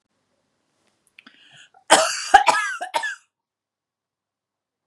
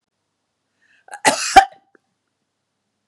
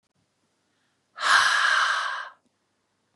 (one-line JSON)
{"three_cough_length": "4.9 s", "three_cough_amplitude": 32768, "three_cough_signal_mean_std_ratio": 0.28, "cough_length": "3.1 s", "cough_amplitude": 32768, "cough_signal_mean_std_ratio": 0.21, "exhalation_length": "3.2 s", "exhalation_amplitude": 20397, "exhalation_signal_mean_std_ratio": 0.47, "survey_phase": "beta (2021-08-13 to 2022-03-07)", "age": "18-44", "gender": "Female", "wearing_mask": "No", "symptom_none": true, "smoker_status": "Never smoked", "respiratory_condition_asthma": false, "respiratory_condition_other": false, "recruitment_source": "REACT", "submission_delay": "9 days", "covid_test_result": "Negative", "covid_test_method": "RT-qPCR", "influenza_a_test_result": "Negative", "influenza_b_test_result": "Negative"}